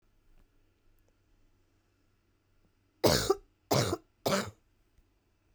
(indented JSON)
{
  "three_cough_length": "5.5 s",
  "three_cough_amplitude": 12386,
  "three_cough_signal_mean_std_ratio": 0.28,
  "survey_phase": "beta (2021-08-13 to 2022-03-07)",
  "age": "18-44",
  "gender": "Female",
  "wearing_mask": "No",
  "symptom_cough_any": true,
  "symptom_runny_or_blocked_nose": true,
  "symptom_sore_throat": true,
  "symptom_fatigue": true,
  "symptom_headache": true,
  "symptom_onset": "3 days",
  "smoker_status": "Never smoked",
  "respiratory_condition_asthma": false,
  "respiratory_condition_other": false,
  "recruitment_source": "Test and Trace",
  "submission_delay": "2 days",
  "covid_test_result": "Positive",
  "covid_test_method": "RT-qPCR"
}